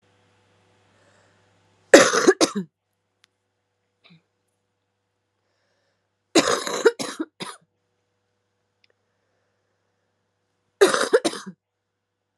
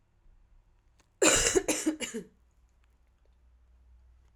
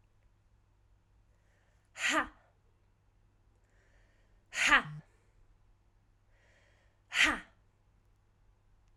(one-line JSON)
{"three_cough_length": "12.4 s", "three_cough_amplitude": 32768, "three_cough_signal_mean_std_ratio": 0.24, "cough_length": "4.4 s", "cough_amplitude": 13087, "cough_signal_mean_std_ratio": 0.33, "exhalation_length": "9.0 s", "exhalation_amplitude": 10276, "exhalation_signal_mean_std_ratio": 0.25, "survey_phase": "alpha (2021-03-01 to 2021-08-12)", "age": "18-44", "gender": "Female", "wearing_mask": "No", "symptom_cough_any": true, "symptom_fatigue": true, "symptom_headache": true, "smoker_status": "Never smoked", "respiratory_condition_asthma": false, "respiratory_condition_other": false, "recruitment_source": "Test and Trace", "submission_delay": "2 days", "covid_test_result": "Positive", "covid_test_method": "RT-qPCR"}